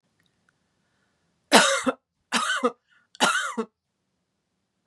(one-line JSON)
{"three_cough_length": "4.9 s", "three_cough_amplitude": 32569, "three_cough_signal_mean_std_ratio": 0.34, "survey_phase": "beta (2021-08-13 to 2022-03-07)", "age": "45-64", "gender": "Female", "wearing_mask": "No", "symptom_none": true, "smoker_status": "Ex-smoker", "respiratory_condition_asthma": false, "respiratory_condition_other": false, "recruitment_source": "REACT", "submission_delay": "1 day", "covid_test_result": "Negative", "covid_test_method": "RT-qPCR", "influenza_a_test_result": "Negative", "influenza_b_test_result": "Negative"}